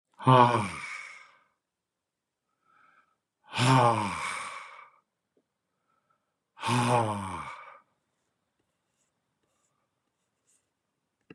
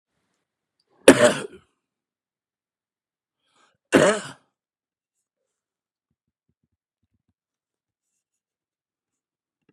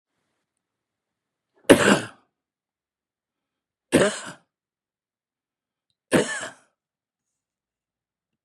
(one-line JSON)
{"exhalation_length": "11.3 s", "exhalation_amplitude": 16243, "exhalation_signal_mean_std_ratio": 0.32, "cough_length": "9.7 s", "cough_amplitude": 32768, "cough_signal_mean_std_ratio": 0.17, "three_cough_length": "8.4 s", "three_cough_amplitude": 32767, "three_cough_signal_mean_std_ratio": 0.21, "survey_phase": "beta (2021-08-13 to 2022-03-07)", "age": "65+", "gender": "Male", "wearing_mask": "No", "symptom_runny_or_blocked_nose": true, "smoker_status": "Never smoked", "respiratory_condition_asthma": false, "respiratory_condition_other": false, "recruitment_source": "REACT", "submission_delay": "2 days", "covid_test_result": "Negative", "covid_test_method": "RT-qPCR", "influenza_a_test_result": "Negative", "influenza_b_test_result": "Negative"}